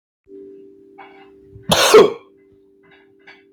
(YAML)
cough_length: 3.5 s
cough_amplitude: 29404
cough_signal_mean_std_ratio: 0.29
survey_phase: beta (2021-08-13 to 2022-03-07)
age: 18-44
gender: Male
wearing_mask: 'No'
symptom_none: true
smoker_status: Ex-smoker
respiratory_condition_asthma: false
respiratory_condition_other: false
recruitment_source: REACT
submission_delay: 1 day
covid_test_result: Negative
covid_test_method: RT-qPCR
influenza_a_test_result: Negative
influenza_b_test_result: Negative